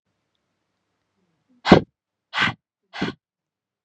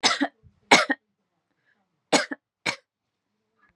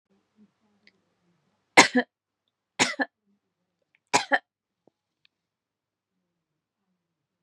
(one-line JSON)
{"exhalation_length": "3.8 s", "exhalation_amplitude": 32768, "exhalation_signal_mean_std_ratio": 0.2, "cough_length": "3.8 s", "cough_amplitude": 28935, "cough_signal_mean_std_ratio": 0.28, "three_cough_length": "7.4 s", "three_cough_amplitude": 32767, "three_cough_signal_mean_std_ratio": 0.17, "survey_phase": "beta (2021-08-13 to 2022-03-07)", "age": "18-44", "gender": "Female", "wearing_mask": "No", "symptom_sore_throat": true, "smoker_status": "Never smoked", "respiratory_condition_asthma": false, "respiratory_condition_other": false, "recruitment_source": "REACT", "submission_delay": "2 days", "covid_test_result": "Negative", "covid_test_method": "RT-qPCR", "influenza_a_test_result": "Negative", "influenza_b_test_result": "Negative"}